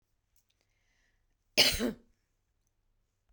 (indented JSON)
{
  "cough_length": "3.3 s",
  "cough_amplitude": 11226,
  "cough_signal_mean_std_ratio": 0.23,
  "survey_phase": "beta (2021-08-13 to 2022-03-07)",
  "age": "45-64",
  "gender": "Female",
  "wearing_mask": "No",
  "symptom_sore_throat": true,
  "symptom_fatigue": true,
  "symptom_onset": "9 days",
  "smoker_status": "Never smoked",
  "respiratory_condition_asthma": false,
  "respiratory_condition_other": false,
  "recruitment_source": "REACT",
  "submission_delay": "2 days",
  "covid_test_result": "Negative",
  "covid_test_method": "RT-qPCR"
}